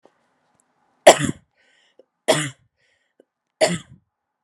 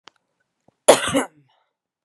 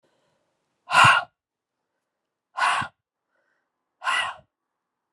three_cough_length: 4.4 s
three_cough_amplitude: 32768
three_cough_signal_mean_std_ratio: 0.22
cough_length: 2.0 s
cough_amplitude: 32768
cough_signal_mean_std_ratio: 0.25
exhalation_length: 5.1 s
exhalation_amplitude: 24716
exhalation_signal_mean_std_ratio: 0.29
survey_phase: beta (2021-08-13 to 2022-03-07)
age: 18-44
gender: Female
wearing_mask: 'No'
symptom_cough_any: true
symptom_runny_or_blocked_nose: true
symptom_sore_throat: true
symptom_diarrhoea: true
symptom_fatigue: true
symptom_headache: true
symptom_loss_of_taste: true
symptom_other: true
symptom_onset: 4 days
smoker_status: Ex-smoker
respiratory_condition_asthma: false
respiratory_condition_other: false
recruitment_source: Test and Trace
submission_delay: 2 days
covid_test_result: Positive
covid_test_method: RT-qPCR
covid_ct_value: 22.9
covid_ct_gene: ORF1ab gene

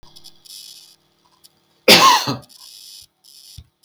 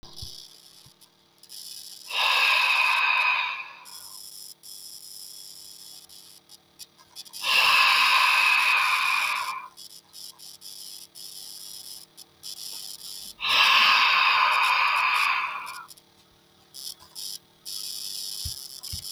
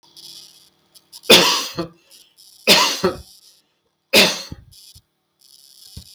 cough_length: 3.8 s
cough_amplitude: 32768
cough_signal_mean_std_ratio: 0.29
exhalation_length: 19.1 s
exhalation_amplitude: 16697
exhalation_signal_mean_std_ratio: 0.56
three_cough_length: 6.1 s
three_cough_amplitude: 32768
three_cough_signal_mean_std_ratio: 0.34
survey_phase: beta (2021-08-13 to 2022-03-07)
age: 45-64
gender: Male
wearing_mask: 'No'
symptom_none: true
smoker_status: Never smoked
respiratory_condition_asthma: false
respiratory_condition_other: false
recruitment_source: REACT
submission_delay: 1 day
covid_test_result: Negative
covid_test_method: RT-qPCR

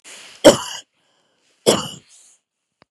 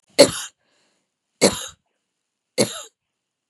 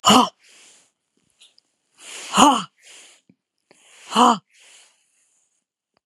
cough_length: 2.9 s
cough_amplitude: 32768
cough_signal_mean_std_ratio: 0.24
three_cough_length: 3.5 s
three_cough_amplitude: 32768
three_cough_signal_mean_std_ratio: 0.24
exhalation_length: 6.1 s
exhalation_amplitude: 32767
exhalation_signal_mean_std_ratio: 0.28
survey_phase: beta (2021-08-13 to 2022-03-07)
age: 45-64
gender: Female
wearing_mask: 'No'
symptom_none: true
smoker_status: Never smoked
respiratory_condition_asthma: false
respiratory_condition_other: false
recruitment_source: REACT
submission_delay: 10 days
covid_test_result: Negative
covid_test_method: RT-qPCR
influenza_a_test_result: Negative
influenza_b_test_result: Negative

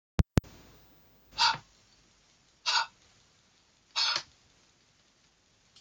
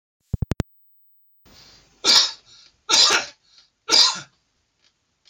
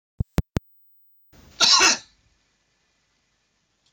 exhalation_length: 5.8 s
exhalation_amplitude: 15140
exhalation_signal_mean_std_ratio: 0.27
three_cough_length: 5.3 s
three_cough_amplitude: 27101
three_cough_signal_mean_std_ratio: 0.33
cough_length: 3.9 s
cough_amplitude: 24281
cough_signal_mean_std_ratio: 0.27
survey_phase: alpha (2021-03-01 to 2021-08-12)
age: 65+
gender: Male
wearing_mask: 'No'
symptom_none: true
smoker_status: Never smoked
respiratory_condition_asthma: true
respiratory_condition_other: false
recruitment_source: REACT
submission_delay: 2 days
covid_test_result: Negative
covid_test_method: RT-qPCR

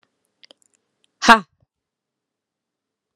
exhalation_length: 3.2 s
exhalation_amplitude: 32768
exhalation_signal_mean_std_ratio: 0.15
survey_phase: alpha (2021-03-01 to 2021-08-12)
age: 18-44
gender: Female
wearing_mask: 'No'
symptom_none: true
smoker_status: Ex-smoker
respiratory_condition_asthma: true
respiratory_condition_other: false
recruitment_source: REACT
submission_delay: 5 days
covid_test_result: Negative
covid_test_method: RT-qPCR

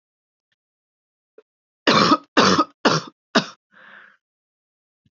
three_cough_length: 5.1 s
three_cough_amplitude: 28092
three_cough_signal_mean_std_ratio: 0.31
survey_phase: beta (2021-08-13 to 2022-03-07)
age: 45-64
gender: Female
wearing_mask: 'No'
symptom_cough_any: true
symptom_new_continuous_cough: true
symptom_runny_or_blocked_nose: true
symptom_fatigue: true
symptom_headache: true
symptom_change_to_sense_of_smell_or_taste: true
symptom_loss_of_taste: true
smoker_status: Never smoked
respiratory_condition_asthma: true
respiratory_condition_other: false
recruitment_source: Test and Trace
submission_delay: 2 days
covid_test_result: Positive
covid_test_method: ePCR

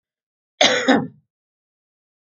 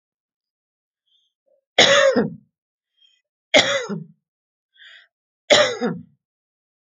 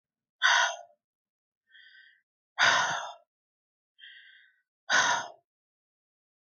cough_length: 2.4 s
cough_amplitude: 29861
cough_signal_mean_std_ratio: 0.32
three_cough_length: 7.0 s
three_cough_amplitude: 30150
three_cough_signal_mean_std_ratio: 0.32
exhalation_length: 6.5 s
exhalation_amplitude: 11353
exhalation_signal_mean_std_ratio: 0.34
survey_phase: alpha (2021-03-01 to 2021-08-12)
age: 65+
gender: Female
wearing_mask: 'No'
symptom_none: true
smoker_status: Ex-smoker
respiratory_condition_asthma: false
respiratory_condition_other: false
recruitment_source: REACT
submission_delay: 1 day
covid_test_result: Negative
covid_test_method: RT-qPCR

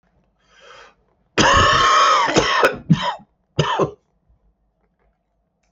cough_length: 5.7 s
cough_amplitude: 31878
cough_signal_mean_std_ratio: 0.49
survey_phase: beta (2021-08-13 to 2022-03-07)
age: 65+
gender: Male
wearing_mask: 'Yes'
symptom_cough_any: true
symptom_new_continuous_cough: true
symptom_runny_or_blocked_nose: true
symptom_sore_throat: true
symptom_fatigue: true
symptom_onset: 4 days
smoker_status: Ex-smoker
respiratory_condition_asthma: false
respiratory_condition_other: false
recruitment_source: Test and Trace
submission_delay: 2 days
covid_test_result: Positive
covid_test_method: RT-qPCR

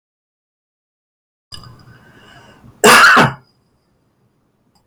cough_length: 4.9 s
cough_amplitude: 32768
cough_signal_mean_std_ratio: 0.29
survey_phase: beta (2021-08-13 to 2022-03-07)
age: 65+
gender: Male
wearing_mask: 'No'
symptom_none: true
smoker_status: Ex-smoker
respiratory_condition_asthma: false
respiratory_condition_other: false
recruitment_source: REACT
submission_delay: 3 days
covid_test_result: Negative
covid_test_method: RT-qPCR
influenza_a_test_result: Negative
influenza_b_test_result: Negative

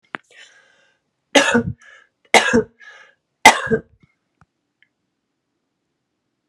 three_cough_length: 6.5 s
three_cough_amplitude: 32768
three_cough_signal_mean_std_ratio: 0.26
survey_phase: beta (2021-08-13 to 2022-03-07)
age: 45-64
gender: Female
wearing_mask: 'No'
symptom_cough_any: true
symptom_shortness_of_breath: true
symptom_sore_throat: true
symptom_fatigue: true
symptom_headache: true
symptom_onset: 2 days
smoker_status: Ex-smoker
respiratory_condition_asthma: true
respiratory_condition_other: false
recruitment_source: Test and Trace
submission_delay: 1 day
covid_test_result: Positive
covid_test_method: RT-qPCR
covid_ct_value: 20.0
covid_ct_gene: ORF1ab gene
covid_ct_mean: 20.4
covid_viral_load: 200000 copies/ml
covid_viral_load_category: Low viral load (10K-1M copies/ml)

